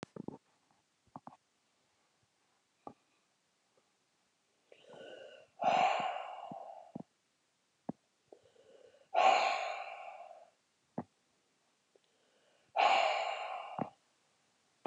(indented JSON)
{
  "exhalation_length": "14.9 s",
  "exhalation_amplitude": 5451,
  "exhalation_signal_mean_std_ratio": 0.33,
  "survey_phase": "beta (2021-08-13 to 2022-03-07)",
  "age": "65+",
  "gender": "Female",
  "wearing_mask": "No",
  "symptom_none": true,
  "smoker_status": "Never smoked",
  "respiratory_condition_asthma": true,
  "respiratory_condition_other": false,
  "recruitment_source": "REACT",
  "submission_delay": "2 days",
  "covid_test_result": "Negative",
  "covid_test_method": "RT-qPCR"
}